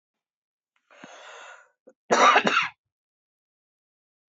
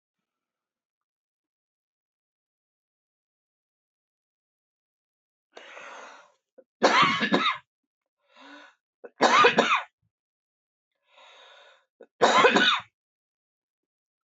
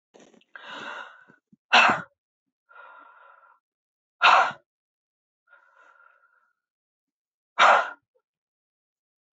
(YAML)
cough_length: 4.4 s
cough_amplitude: 24571
cough_signal_mean_std_ratio: 0.28
three_cough_length: 14.3 s
three_cough_amplitude: 22908
three_cough_signal_mean_std_ratio: 0.29
exhalation_length: 9.4 s
exhalation_amplitude: 22167
exhalation_signal_mean_std_ratio: 0.25
survey_phase: beta (2021-08-13 to 2022-03-07)
age: 45-64
gender: Female
wearing_mask: 'No'
symptom_none: true
smoker_status: Ex-smoker
respiratory_condition_asthma: false
respiratory_condition_other: false
recruitment_source: REACT
submission_delay: 2 days
covid_test_result: Negative
covid_test_method: RT-qPCR